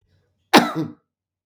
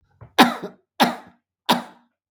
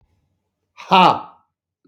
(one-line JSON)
{"cough_length": "1.5 s", "cough_amplitude": 32768, "cough_signal_mean_std_ratio": 0.29, "three_cough_length": "2.3 s", "three_cough_amplitude": 32768, "three_cough_signal_mean_std_ratio": 0.31, "exhalation_length": "1.9 s", "exhalation_amplitude": 32766, "exhalation_signal_mean_std_ratio": 0.31, "survey_phase": "beta (2021-08-13 to 2022-03-07)", "age": "45-64", "gender": "Male", "wearing_mask": "No", "symptom_none": true, "smoker_status": "Ex-smoker", "respiratory_condition_asthma": false, "respiratory_condition_other": false, "recruitment_source": "Test and Trace", "submission_delay": "0 days", "covid_test_result": "Negative", "covid_test_method": "LFT"}